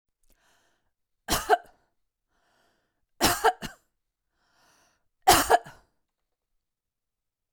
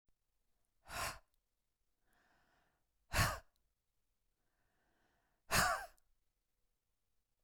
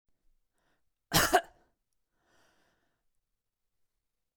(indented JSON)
{
  "three_cough_length": "7.5 s",
  "three_cough_amplitude": 20891,
  "three_cough_signal_mean_std_ratio": 0.24,
  "exhalation_length": "7.4 s",
  "exhalation_amplitude": 3322,
  "exhalation_signal_mean_std_ratio": 0.25,
  "cough_length": "4.4 s",
  "cough_amplitude": 10837,
  "cough_signal_mean_std_ratio": 0.19,
  "survey_phase": "beta (2021-08-13 to 2022-03-07)",
  "age": "45-64",
  "gender": "Female",
  "wearing_mask": "No",
  "symptom_none": true,
  "smoker_status": "Never smoked",
  "respiratory_condition_asthma": false,
  "respiratory_condition_other": false,
  "recruitment_source": "REACT",
  "submission_delay": "0 days",
  "covid_test_result": "Negative",
  "covid_test_method": "RT-qPCR",
  "influenza_a_test_result": "Unknown/Void",
  "influenza_b_test_result": "Unknown/Void"
}